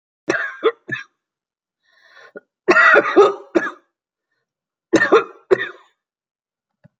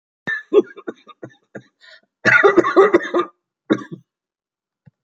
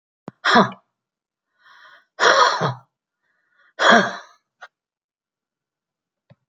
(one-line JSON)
{"three_cough_length": "7.0 s", "three_cough_amplitude": 28897, "three_cough_signal_mean_std_ratio": 0.35, "cough_length": "5.0 s", "cough_amplitude": 29862, "cough_signal_mean_std_ratio": 0.37, "exhalation_length": "6.5 s", "exhalation_amplitude": 29388, "exhalation_signal_mean_std_ratio": 0.31, "survey_phase": "beta (2021-08-13 to 2022-03-07)", "age": "65+", "gender": "Female", "wearing_mask": "No", "symptom_cough_any": true, "symptom_sore_throat": true, "smoker_status": "Never smoked", "respiratory_condition_asthma": false, "respiratory_condition_other": false, "recruitment_source": "REACT", "submission_delay": "2 days", "covid_test_result": "Negative", "covid_test_method": "RT-qPCR"}